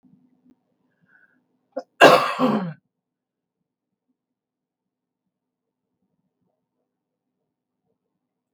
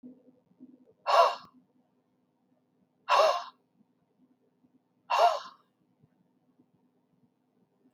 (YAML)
cough_length: 8.5 s
cough_amplitude: 32768
cough_signal_mean_std_ratio: 0.18
exhalation_length: 7.9 s
exhalation_amplitude: 12242
exhalation_signal_mean_std_ratio: 0.27
survey_phase: beta (2021-08-13 to 2022-03-07)
age: 65+
gender: Female
wearing_mask: 'No'
symptom_none: true
smoker_status: Ex-smoker
respiratory_condition_asthma: false
respiratory_condition_other: false
recruitment_source: REACT
submission_delay: 1 day
covid_test_result: Negative
covid_test_method: RT-qPCR
influenza_a_test_result: Unknown/Void
influenza_b_test_result: Unknown/Void